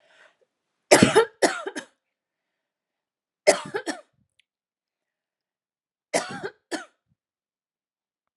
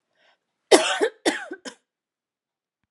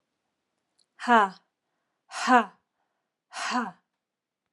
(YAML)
three_cough_length: 8.4 s
three_cough_amplitude: 30736
three_cough_signal_mean_std_ratio: 0.23
cough_length: 2.9 s
cough_amplitude: 32227
cough_signal_mean_std_ratio: 0.29
exhalation_length: 4.5 s
exhalation_amplitude: 16809
exhalation_signal_mean_std_ratio: 0.28
survey_phase: alpha (2021-03-01 to 2021-08-12)
age: 45-64
gender: Female
wearing_mask: 'No'
symptom_cough_any: true
symptom_new_continuous_cough: true
symptom_headache: true
symptom_onset: 3 days
smoker_status: Ex-smoker
respiratory_condition_asthma: false
respiratory_condition_other: false
recruitment_source: Test and Trace
submission_delay: 2 days
covid_test_result: Positive
covid_test_method: RT-qPCR
covid_ct_value: 16.4
covid_ct_gene: N gene
covid_ct_mean: 16.6
covid_viral_load: 3600000 copies/ml
covid_viral_load_category: High viral load (>1M copies/ml)